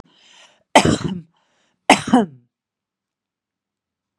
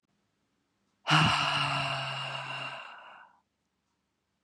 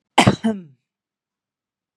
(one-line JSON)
{"three_cough_length": "4.2 s", "three_cough_amplitude": 32768, "three_cough_signal_mean_std_ratio": 0.27, "exhalation_length": "4.4 s", "exhalation_amplitude": 13193, "exhalation_signal_mean_std_ratio": 0.47, "cough_length": "2.0 s", "cough_amplitude": 32767, "cough_signal_mean_std_ratio": 0.27, "survey_phase": "beta (2021-08-13 to 2022-03-07)", "age": "45-64", "gender": "Female", "wearing_mask": "No", "symptom_none": true, "smoker_status": "Never smoked", "respiratory_condition_asthma": true, "respiratory_condition_other": false, "recruitment_source": "REACT", "submission_delay": "3 days", "covid_test_result": "Negative", "covid_test_method": "RT-qPCR", "influenza_a_test_result": "Negative", "influenza_b_test_result": "Negative"}